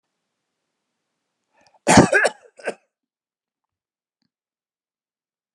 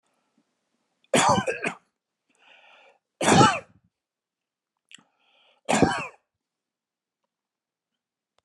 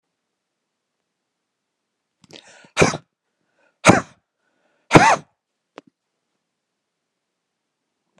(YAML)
cough_length: 5.5 s
cough_amplitude: 32768
cough_signal_mean_std_ratio: 0.2
three_cough_length: 8.4 s
three_cough_amplitude: 22691
three_cough_signal_mean_std_ratio: 0.28
exhalation_length: 8.2 s
exhalation_amplitude: 32768
exhalation_signal_mean_std_ratio: 0.19
survey_phase: beta (2021-08-13 to 2022-03-07)
age: 45-64
gender: Male
wearing_mask: 'No'
symptom_none: true
smoker_status: Prefer not to say
respiratory_condition_asthma: false
respiratory_condition_other: false
recruitment_source: REACT
submission_delay: 2 days
covid_test_result: Negative
covid_test_method: RT-qPCR